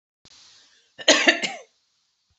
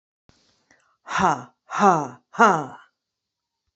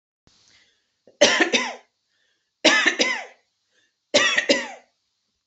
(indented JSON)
{
  "cough_length": "2.4 s",
  "cough_amplitude": 30747,
  "cough_signal_mean_std_ratio": 0.29,
  "exhalation_length": "3.8 s",
  "exhalation_amplitude": 27200,
  "exhalation_signal_mean_std_ratio": 0.34,
  "three_cough_length": "5.5 s",
  "three_cough_amplitude": 27955,
  "three_cough_signal_mean_std_ratio": 0.4,
  "survey_phase": "beta (2021-08-13 to 2022-03-07)",
  "age": "18-44",
  "gender": "Female",
  "wearing_mask": "No",
  "symptom_none": true,
  "smoker_status": "Ex-smoker",
  "respiratory_condition_asthma": false,
  "respiratory_condition_other": false,
  "recruitment_source": "Test and Trace",
  "submission_delay": "1 day",
  "covid_test_result": "Negative",
  "covid_test_method": "RT-qPCR"
}